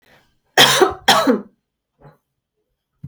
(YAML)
cough_length: 3.1 s
cough_amplitude: 32480
cough_signal_mean_std_ratio: 0.37
survey_phase: alpha (2021-03-01 to 2021-08-12)
age: 18-44
gender: Female
wearing_mask: 'No'
symptom_cough_any: true
symptom_fatigue: true
symptom_fever_high_temperature: true
symptom_onset: 9 days
smoker_status: Never smoked
respiratory_condition_asthma: false
respiratory_condition_other: false
recruitment_source: Test and Trace
submission_delay: 2 days
covid_test_result: Positive
covid_test_method: RT-qPCR
covid_ct_value: 21.3
covid_ct_gene: ORF1ab gene